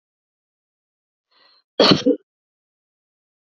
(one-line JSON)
{"three_cough_length": "3.4 s", "three_cough_amplitude": 27799, "three_cough_signal_mean_std_ratio": 0.23, "survey_phase": "beta (2021-08-13 to 2022-03-07)", "age": "45-64", "gender": "Female", "wearing_mask": "No", "symptom_none": true, "smoker_status": "Ex-smoker", "respiratory_condition_asthma": false, "respiratory_condition_other": false, "recruitment_source": "REACT", "submission_delay": "1 day", "covid_test_result": "Negative", "covid_test_method": "RT-qPCR"}